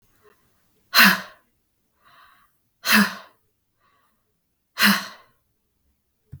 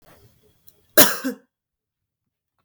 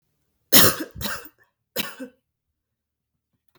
exhalation_length: 6.4 s
exhalation_amplitude: 32766
exhalation_signal_mean_std_ratio: 0.26
cough_length: 2.6 s
cough_amplitude: 32768
cough_signal_mean_std_ratio: 0.21
three_cough_length: 3.6 s
three_cough_amplitude: 32768
three_cough_signal_mean_std_ratio: 0.26
survey_phase: beta (2021-08-13 to 2022-03-07)
age: 18-44
gender: Female
wearing_mask: 'No'
symptom_runny_or_blocked_nose: true
smoker_status: Never smoked
respiratory_condition_asthma: false
respiratory_condition_other: false
recruitment_source: REACT
submission_delay: 0 days
covid_test_result: Negative
covid_test_method: RT-qPCR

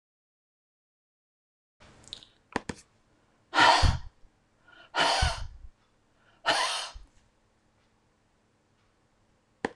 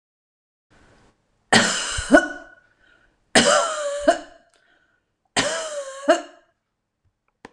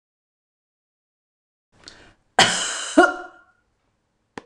exhalation_length: 9.8 s
exhalation_amplitude: 17633
exhalation_signal_mean_std_ratio: 0.29
three_cough_length: 7.5 s
three_cough_amplitude: 26028
three_cough_signal_mean_std_ratio: 0.37
cough_length: 4.5 s
cough_amplitude: 26028
cough_signal_mean_std_ratio: 0.26
survey_phase: beta (2021-08-13 to 2022-03-07)
age: 45-64
gender: Female
wearing_mask: 'No'
symptom_none: true
symptom_onset: 13 days
smoker_status: Ex-smoker
respiratory_condition_asthma: false
respiratory_condition_other: false
recruitment_source: REACT
submission_delay: 31 days
covid_test_result: Negative
covid_test_method: RT-qPCR
influenza_a_test_result: Unknown/Void
influenza_b_test_result: Unknown/Void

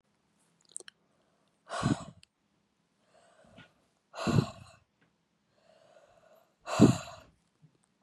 exhalation_length: 8.0 s
exhalation_amplitude: 14766
exhalation_signal_mean_std_ratio: 0.23
survey_phase: beta (2021-08-13 to 2022-03-07)
age: 18-44
gender: Female
wearing_mask: 'No'
symptom_none: true
symptom_onset: 12 days
smoker_status: Current smoker (1 to 10 cigarettes per day)
respiratory_condition_asthma: false
respiratory_condition_other: false
recruitment_source: REACT
submission_delay: 4 days
covid_test_result: Negative
covid_test_method: RT-qPCR
influenza_a_test_result: Negative
influenza_b_test_result: Negative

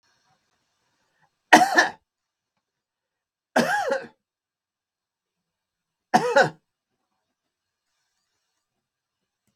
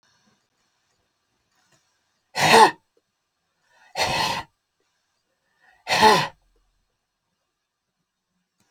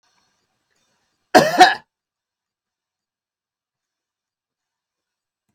three_cough_length: 9.6 s
three_cough_amplitude: 32768
three_cough_signal_mean_std_ratio: 0.23
exhalation_length: 8.7 s
exhalation_amplitude: 31802
exhalation_signal_mean_std_ratio: 0.26
cough_length: 5.5 s
cough_amplitude: 32768
cough_signal_mean_std_ratio: 0.18
survey_phase: beta (2021-08-13 to 2022-03-07)
age: 65+
gender: Male
wearing_mask: 'No'
symptom_none: true
smoker_status: Ex-smoker
respiratory_condition_asthma: false
respiratory_condition_other: false
recruitment_source: REACT
submission_delay: 4 days
covid_test_result: Negative
covid_test_method: RT-qPCR
influenza_a_test_result: Negative
influenza_b_test_result: Negative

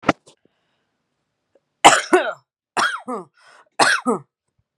three_cough_length: 4.8 s
three_cough_amplitude: 32768
three_cough_signal_mean_std_ratio: 0.32
survey_phase: beta (2021-08-13 to 2022-03-07)
age: 18-44
gender: Female
wearing_mask: 'No'
symptom_none: true
smoker_status: Ex-smoker
respiratory_condition_asthma: false
respiratory_condition_other: false
recruitment_source: REACT
submission_delay: 1 day
covid_test_result: Negative
covid_test_method: RT-qPCR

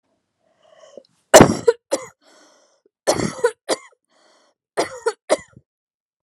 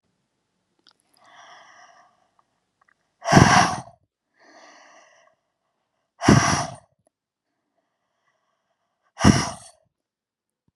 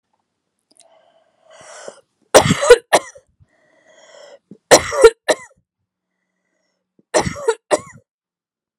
cough_length: 6.2 s
cough_amplitude: 32768
cough_signal_mean_std_ratio: 0.25
exhalation_length: 10.8 s
exhalation_amplitude: 32768
exhalation_signal_mean_std_ratio: 0.25
three_cough_length: 8.8 s
three_cough_amplitude: 32768
three_cough_signal_mean_std_ratio: 0.26
survey_phase: alpha (2021-03-01 to 2021-08-12)
age: 18-44
gender: Female
wearing_mask: 'No'
symptom_none: true
smoker_status: Never smoked
respiratory_condition_asthma: false
respiratory_condition_other: false
recruitment_source: REACT
submission_delay: 1 day
covid_test_result: Negative
covid_test_method: RT-qPCR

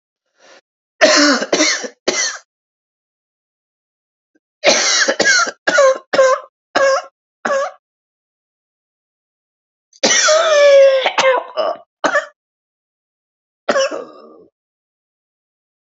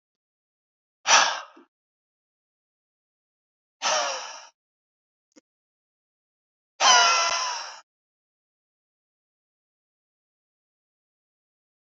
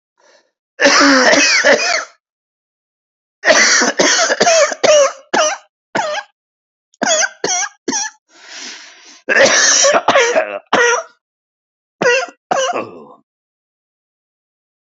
three_cough_length: 16.0 s
three_cough_amplitude: 31723
three_cough_signal_mean_std_ratio: 0.46
exhalation_length: 11.9 s
exhalation_amplitude: 22101
exhalation_signal_mean_std_ratio: 0.26
cough_length: 14.9 s
cough_amplitude: 32768
cough_signal_mean_std_ratio: 0.55
survey_phase: beta (2021-08-13 to 2022-03-07)
age: 45-64
gender: Male
wearing_mask: 'Yes'
symptom_cough_any: true
symptom_diarrhoea: true
smoker_status: Ex-smoker
respiratory_condition_asthma: false
respiratory_condition_other: false
recruitment_source: Test and Trace
submission_delay: 2 days
covid_test_result: Positive
covid_test_method: ePCR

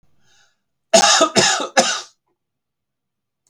cough_length: 3.5 s
cough_amplitude: 32768
cough_signal_mean_std_ratio: 0.39
survey_phase: beta (2021-08-13 to 2022-03-07)
age: 45-64
gender: Male
wearing_mask: 'No'
symptom_cough_any: true
smoker_status: Never smoked
respiratory_condition_asthma: false
respiratory_condition_other: false
recruitment_source: REACT
submission_delay: 4 days
covid_test_result: Negative
covid_test_method: RT-qPCR
influenza_a_test_result: Negative
influenza_b_test_result: Negative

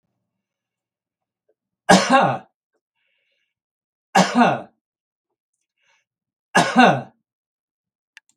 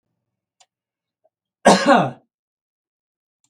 three_cough_length: 8.4 s
three_cough_amplitude: 32766
three_cough_signal_mean_std_ratio: 0.29
cough_length: 3.5 s
cough_amplitude: 32768
cough_signal_mean_std_ratio: 0.26
survey_phase: beta (2021-08-13 to 2022-03-07)
age: 65+
gender: Male
wearing_mask: 'No'
symptom_none: true
smoker_status: Ex-smoker
respiratory_condition_asthma: false
respiratory_condition_other: false
recruitment_source: REACT
submission_delay: 2 days
covid_test_result: Negative
covid_test_method: RT-qPCR
influenza_a_test_result: Negative
influenza_b_test_result: Negative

